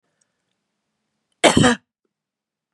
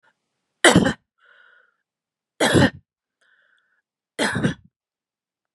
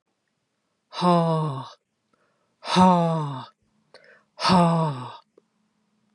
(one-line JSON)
{"cough_length": "2.7 s", "cough_amplitude": 32702, "cough_signal_mean_std_ratio": 0.25, "three_cough_length": "5.5 s", "three_cough_amplitude": 31043, "three_cough_signal_mean_std_ratio": 0.29, "exhalation_length": "6.1 s", "exhalation_amplitude": 21394, "exhalation_signal_mean_std_ratio": 0.46, "survey_phase": "beta (2021-08-13 to 2022-03-07)", "age": "45-64", "gender": "Female", "wearing_mask": "No", "symptom_none": true, "smoker_status": "Never smoked", "respiratory_condition_asthma": false, "respiratory_condition_other": false, "recruitment_source": "REACT", "submission_delay": "4 days", "covid_test_result": "Negative", "covid_test_method": "RT-qPCR"}